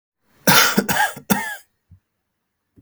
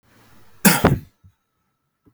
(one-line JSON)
{"three_cough_length": "2.8 s", "three_cough_amplitude": 32768, "three_cough_signal_mean_std_ratio": 0.4, "cough_length": "2.1 s", "cough_amplitude": 32768, "cough_signal_mean_std_ratio": 0.3, "survey_phase": "beta (2021-08-13 to 2022-03-07)", "age": "18-44", "gender": "Male", "wearing_mask": "No", "symptom_none": true, "smoker_status": "Never smoked", "respiratory_condition_asthma": false, "respiratory_condition_other": false, "recruitment_source": "REACT", "submission_delay": "1 day", "covid_test_result": "Negative", "covid_test_method": "RT-qPCR", "influenza_a_test_result": "Negative", "influenza_b_test_result": "Negative"}